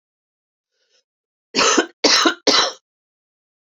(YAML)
three_cough_length: 3.7 s
three_cough_amplitude: 28511
three_cough_signal_mean_std_ratio: 0.38
survey_phase: alpha (2021-03-01 to 2021-08-12)
age: 45-64
gender: Female
wearing_mask: 'No'
symptom_shortness_of_breath: true
symptom_fatigue: true
symptom_headache: true
symptom_change_to_sense_of_smell_or_taste: true
symptom_loss_of_taste: true
symptom_onset: 3 days
smoker_status: Ex-smoker
respiratory_condition_asthma: true
respiratory_condition_other: false
recruitment_source: Test and Trace
submission_delay: 2 days
covid_test_result: Positive
covid_test_method: RT-qPCR
covid_ct_value: 14.9
covid_ct_gene: S gene
covid_ct_mean: 15.0
covid_viral_load: 12000000 copies/ml
covid_viral_load_category: High viral load (>1M copies/ml)